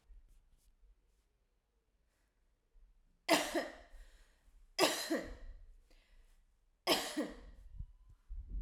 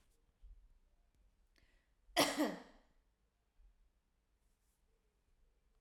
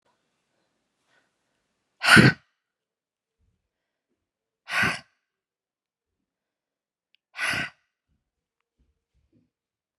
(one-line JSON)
{"three_cough_length": "8.6 s", "three_cough_amplitude": 6149, "three_cough_signal_mean_std_ratio": 0.36, "cough_length": "5.8 s", "cough_amplitude": 3850, "cough_signal_mean_std_ratio": 0.22, "exhalation_length": "10.0 s", "exhalation_amplitude": 29232, "exhalation_signal_mean_std_ratio": 0.18, "survey_phase": "alpha (2021-03-01 to 2021-08-12)", "age": "18-44", "gender": "Female", "wearing_mask": "No", "symptom_none": true, "smoker_status": "Never smoked", "respiratory_condition_asthma": false, "respiratory_condition_other": false, "recruitment_source": "REACT", "submission_delay": "1 day", "covid_test_result": "Negative", "covid_test_method": "RT-qPCR"}